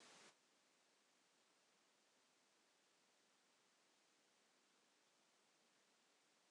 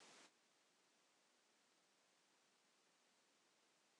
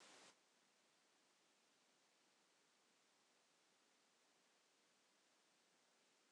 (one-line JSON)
{"three_cough_length": "6.5 s", "three_cough_amplitude": 53, "three_cough_signal_mean_std_ratio": 0.85, "cough_length": "4.0 s", "cough_amplitude": 67, "cough_signal_mean_std_ratio": 0.79, "exhalation_length": "6.3 s", "exhalation_amplitude": 63, "exhalation_signal_mean_std_ratio": 0.84, "survey_phase": "beta (2021-08-13 to 2022-03-07)", "age": "65+", "gender": "Female", "wearing_mask": "No", "symptom_cough_any": true, "smoker_status": "Never smoked", "respiratory_condition_asthma": false, "respiratory_condition_other": false, "recruitment_source": "Test and Trace", "submission_delay": "2 days", "covid_test_result": "Positive", "covid_test_method": "ePCR"}